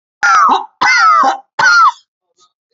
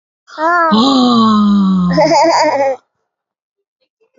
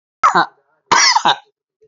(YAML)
cough_length: 2.7 s
cough_amplitude: 29905
cough_signal_mean_std_ratio: 0.68
exhalation_length: 4.2 s
exhalation_amplitude: 29258
exhalation_signal_mean_std_ratio: 0.78
three_cough_length: 1.9 s
three_cough_amplitude: 31615
three_cough_signal_mean_std_ratio: 0.47
survey_phase: alpha (2021-03-01 to 2021-08-12)
age: 45-64
gender: Female
wearing_mask: 'No'
symptom_cough_any: true
symptom_headache: true
symptom_onset: 12 days
smoker_status: Ex-smoker
respiratory_condition_asthma: true
respiratory_condition_other: false
recruitment_source: REACT
submission_delay: 2 days
covid_test_result: Negative
covid_test_method: RT-qPCR